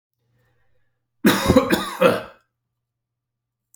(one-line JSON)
{"cough_length": "3.8 s", "cough_amplitude": 27313, "cough_signal_mean_std_ratio": 0.35, "survey_phase": "alpha (2021-03-01 to 2021-08-12)", "age": "45-64", "gender": "Male", "wearing_mask": "No", "symptom_none": true, "smoker_status": "Never smoked", "respiratory_condition_asthma": false, "respiratory_condition_other": false, "recruitment_source": "REACT", "submission_delay": "1 day", "covid_test_result": "Negative", "covid_test_method": "RT-qPCR"}